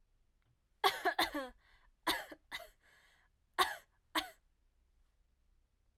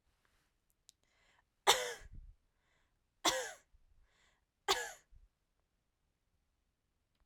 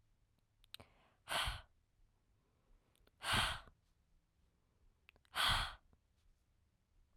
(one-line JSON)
{"cough_length": "6.0 s", "cough_amplitude": 5598, "cough_signal_mean_std_ratio": 0.31, "three_cough_length": "7.3 s", "three_cough_amplitude": 10921, "three_cough_signal_mean_std_ratio": 0.23, "exhalation_length": "7.2 s", "exhalation_amplitude": 2575, "exhalation_signal_mean_std_ratio": 0.32, "survey_phase": "alpha (2021-03-01 to 2021-08-12)", "age": "18-44", "gender": "Female", "wearing_mask": "No", "symptom_none": true, "smoker_status": "Never smoked", "respiratory_condition_asthma": false, "respiratory_condition_other": false, "recruitment_source": "REACT", "submission_delay": "1 day", "covid_test_result": "Negative", "covid_test_method": "RT-qPCR"}